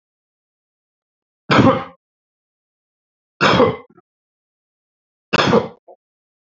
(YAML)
three_cough_length: 6.6 s
three_cough_amplitude: 31679
three_cough_signal_mean_std_ratio: 0.3
survey_phase: beta (2021-08-13 to 2022-03-07)
age: 45-64
gender: Male
wearing_mask: 'No'
symptom_none: true
smoker_status: Current smoker (1 to 10 cigarettes per day)
respiratory_condition_asthma: false
respiratory_condition_other: false
recruitment_source: REACT
submission_delay: 1 day
covid_test_result: Negative
covid_test_method: RT-qPCR
influenza_a_test_result: Negative
influenza_b_test_result: Negative